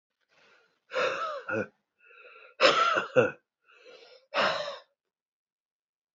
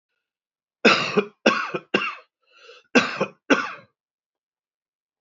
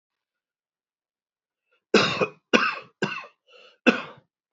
{"exhalation_length": "6.1 s", "exhalation_amplitude": 17120, "exhalation_signal_mean_std_ratio": 0.39, "cough_length": "5.2 s", "cough_amplitude": 26554, "cough_signal_mean_std_ratio": 0.35, "three_cough_length": "4.5 s", "three_cough_amplitude": 26107, "three_cough_signal_mean_std_ratio": 0.3, "survey_phase": "beta (2021-08-13 to 2022-03-07)", "age": "45-64", "gender": "Male", "wearing_mask": "No", "symptom_runny_or_blocked_nose": true, "symptom_fatigue": true, "symptom_headache": true, "symptom_change_to_sense_of_smell_or_taste": true, "symptom_loss_of_taste": true, "smoker_status": "Never smoked", "respiratory_condition_asthma": false, "respiratory_condition_other": false, "recruitment_source": "Test and Trace", "submission_delay": "1 day", "covid_test_result": "Positive", "covid_test_method": "RT-qPCR", "covid_ct_value": 20.0, "covid_ct_gene": "N gene", "covid_ct_mean": 20.4, "covid_viral_load": "200000 copies/ml", "covid_viral_load_category": "Low viral load (10K-1M copies/ml)"}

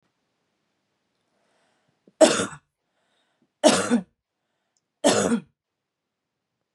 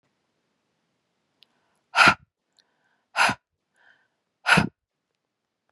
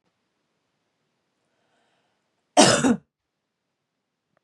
{"three_cough_length": "6.7 s", "three_cough_amplitude": 30909, "three_cough_signal_mean_std_ratio": 0.27, "exhalation_length": "5.7 s", "exhalation_amplitude": 25082, "exhalation_signal_mean_std_ratio": 0.23, "cough_length": "4.4 s", "cough_amplitude": 30445, "cough_signal_mean_std_ratio": 0.22, "survey_phase": "beta (2021-08-13 to 2022-03-07)", "age": "18-44", "gender": "Female", "wearing_mask": "No", "symptom_none": true, "smoker_status": "Never smoked", "respiratory_condition_asthma": false, "respiratory_condition_other": false, "recruitment_source": "REACT", "submission_delay": "1 day", "covid_test_result": "Negative", "covid_test_method": "RT-qPCR", "influenza_a_test_result": "Negative", "influenza_b_test_result": "Negative"}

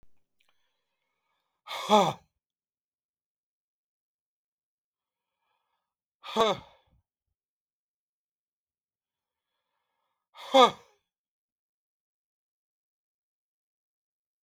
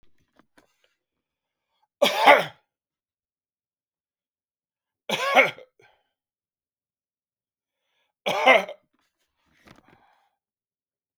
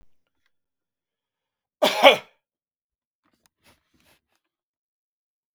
{"exhalation_length": "14.4 s", "exhalation_amplitude": 17203, "exhalation_signal_mean_std_ratio": 0.15, "three_cough_length": "11.2 s", "three_cough_amplitude": 31166, "three_cough_signal_mean_std_ratio": 0.22, "cough_length": "5.5 s", "cough_amplitude": 32768, "cough_signal_mean_std_ratio": 0.16, "survey_phase": "beta (2021-08-13 to 2022-03-07)", "age": "45-64", "gender": "Male", "wearing_mask": "No", "symptom_none": true, "smoker_status": "Never smoked", "respiratory_condition_asthma": false, "respiratory_condition_other": false, "recruitment_source": "REACT", "submission_delay": "2 days", "covid_test_result": "Negative", "covid_test_method": "RT-qPCR", "influenza_a_test_result": "Negative", "influenza_b_test_result": "Negative"}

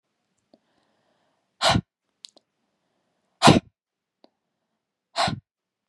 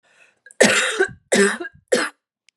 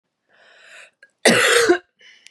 {"exhalation_length": "5.9 s", "exhalation_amplitude": 29034, "exhalation_signal_mean_std_ratio": 0.21, "three_cough_length": "2.6 s", "three_cough_amplitude": 32538, "three_cough_signal_mean_std_ratio": 0.47, "cough_length": "2.3 s", "cough_amplitude": 31514, "cough_signal_mean_std_ratio": 0.41, "survey_phase": "beta (2021-08-13 to 2022-03-07)", "age": "18-44", "gender": "Female", "wearing_mask": "No", "symptom_cough_any": true, "symptom_sore_throat": true, "symptom_onset": "3 days", "smoker_status": "Never smoked", "respiratory_condition_asthma": false, "respiratory_condition_other": false, "recruitment_source": "Test and Trace", "submission_delay": "2 days", "covid_test_result": "Positive", "covid_test_method": "RT-qPCR", "covid_ct_value": 34.0, "covid_ct_gene": "ORF1ab gene", "covid_ct_mean": 34.3, "covid_viral_load": "5.8 copies/ml", "covid_viral_load_category": "Minimal viral load (< 10K copies/ml)"}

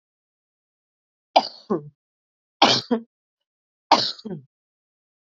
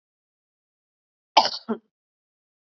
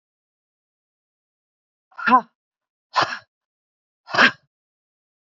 {"three_cough_length": "5.3 s", "three_cough_amplitude": 32767, "three_cough_signal_mean_std_ratio": 0.26, "cough_length": "2.7 s", "cough_amplitude": 30552, "cough_signal_mean_std_ratio": 0.18, "exhalation_length": "5.3 s", "exhalation_amplitude": 27537, "exhalation_signal_mean_std_ratio": 0.23, "survey_phase": "beta (2021-08-13 to 2022-03-07)", "age": "45-64", "gender": "Female", "wearing_mask": "No", "symptom_runny_or_blocked_nose": true, "symptom_sore_throat": true, "symptom_onset": "12 days", "smoker_status": "Ex-smoker", "respiratory_condition_asthma": false, "respiratory_condition_other": false, "recruitment_source": "REACT", "submission_delay": "3 days", "covid_test_result": "Positive", "covid_test_method": "RT-qPCR", "covid_ct_value": 34.0, "covid_ct_gene": "N gene", "influenza_a_test_result": "Negative", "influenza_b_test_result": "Negative"}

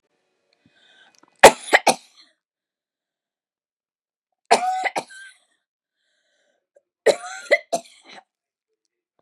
{"three_cough_length": "9.2 s", "three_cough_amplitude": 32768, "three_cough_signal_mean_std_ratio": 0.2, "survey_phase": "beta (2021-08-13 to 2022-03-07)", "age": "65+", "gender": "Female", "wearing_mask": "No", "symptom_none": true, "symptom_onset": "12 days", "smoker_status": "Ex-smoker", "respiratory_condition_asthma": false, "respiratory_condition_other": true, "recruitment_source": "REACT", "submission_delay": "1 day", "covid_test_result": "Negative", "covid_test_method": "RT-qPCR", "influenza_a_test_result": "Negative", "influenza_b_test_result": "Negative"}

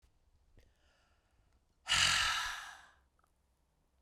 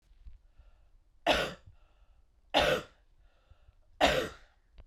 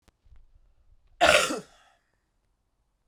{"exhalation_length": "4.0 s", "exhalation_amplitude": 4877, "exhalation_signal_mean_std_ratio": 0.35, "three_cough_length": "4.9 s", "three_cough_amplitude": 10307, "three_cough_signal_mean_std_ratio": 0.35, "cough_length": "3.1 s", "cough_amplitude": 24578, "cough_signal_mean_std_ratio": 0.27, "survey_phase": "beta (2021-08-13 to 2022-03-07)", "age": "18-44", "gender": "Female", "wearing_mask": "No", "symptom_cough_any": true, "symptom_runny_or_blocked_nose": true, "symptom_fatigue": true, "symptom_change_to_sense_of_smell_or_taste": true, "smoker_status": "Never smoked", "respiratory_condition_asthma": false, "respiratory_condition_other": false, "recruitment_source": "Test and Trace", "submission_delay": "2 days", "covid_test_result": "Positive", "covid_test_method": "LFT"}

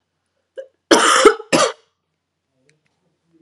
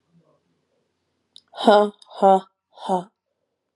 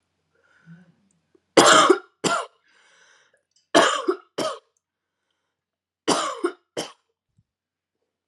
{"cough_length": "3.4 s", "cough_amplitude": 32768, "cough_signal_mean_std_ratio": 0.33, "exhalation_length": "3.8 s", "exhalation_amplitude": 30678, "exhalation_signal_mean_std_ratio": 0.29, "three_cough_length": "8.3 s", "three_cough_amplitude": 32424, "three_cough_signal_mean_std_ratio": 0.3, "survey_phase": "alpha (2021-03-01 to 2021-08-12)", "age": "18-44", "gender": "Female", "wearing_mask": "No", "symptom_cough_any": true, "symptom_change_to_sense_of_smell_or_taste": true, "symptom_onset": "7 days", "smoker_status": "Never smoked", "respiratory_condition_asthma": false, "respiratory_condition_other": false, "recruitment_source": "Test and Trace", "submission_delay": "2 days", "covid_test_result": "Positive", "covid_test_method": "RT-qPCR"}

